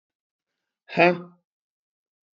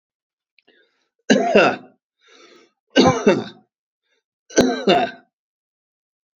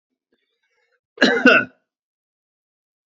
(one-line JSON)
{"exhalation_length": "2.4 s", "exhalation_amplitude": 26645, "exhalation_signal_mean_std_ratio": 0.22, "three_cough_length": "6.4 s", "three_cough_amplitude": 32767, "three_cough_signal_mean_std_ratio": 0.36, "cough_length": "3.1 s", "cough_amplitude": 27877, "cough_signal_mean_std_ratio": 0.27, "survey_phase": "beta (2021-08-13 to 2022-03-07)", "age": "65+", "gender": "Male", "wearing_mask": "No", "symptom_none": true, "smoker_status": "Ex-smoker", "respiratory_condition_asthma": false, "respiratory_condition_other": false, "recruitment_source": "REACT", "submission_delay": "1 day", "covid_test_result": "Negative", "covid_test_method": "RT-qPCR"}